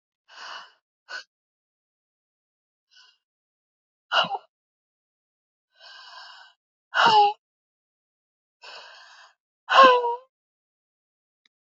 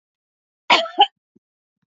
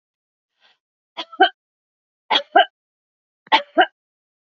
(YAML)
exhalation_length: 11.7 s
exhalation_amplitude: 25490
exhalation_signal_mean_std_ratio: 0.24
cough_length: 1.9 s
cough_amplitude: 28645
cough_signal_mean_std_ratio: 0.26
three_cough_length: 4.4 s
three_cough_amplitude: 28857
three_cough_signal_mean_std_ratio: 0.25
survey_phase: beta (2021-08-13 to 2022-03-07)
age: 45-64
gender: Female
wearing_mask: 'Yes'
symptom_none: true
smoker_status: Never smoked
respiratory_condition_asthma: false
respiratory_condition_other: false
recruitment_source: REACT
submission_delay: 2 days
covid_test_result: Negative
covid_test_method: RT-qPCR
influenza_a_test_result: Unknown/Void
influenza_b_test_result: Unknown/Void